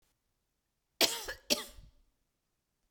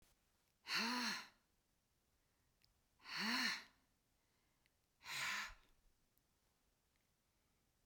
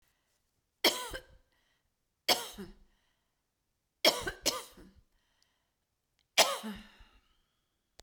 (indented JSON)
{
  "cough_length": "2.9 s",
  "cough_amplitude": 9265,
  "cough_signal_mean_std_ratio": 0.25,
  "exhalation_length": "7.9 s",
  "exhalation_amplitude": 1318,
  "exhalation_signal_mean_std_ratio": 0.38,
  "three_cough_length": "8.0 s",
  "three_cough_amplitude": 15339,
  "three_cough_signal_mean_std_ratio": 0.25,
  "survey_phase": "beta (2021-08-13 to 2022-03-07)",
  "age": "65+",
  "gender": "Female",
  "wearing_mask": "No",
  "symptom_cough_any": true,
  "symptom_runny_or_blocked_nose": true,
  "symptom_headache": true,
  "symptom_onset": "12 days",
  "smoker_status": "Never smoked",
  "respiratory_condition_asthma": false,
  "respiratory_condition_other": false,
  "recruitment_source": "REACT",
  "submission_delay": "2 days",
  "covid_test_result": "Negative",
  "covid_test_method": "RT-qPCR"
}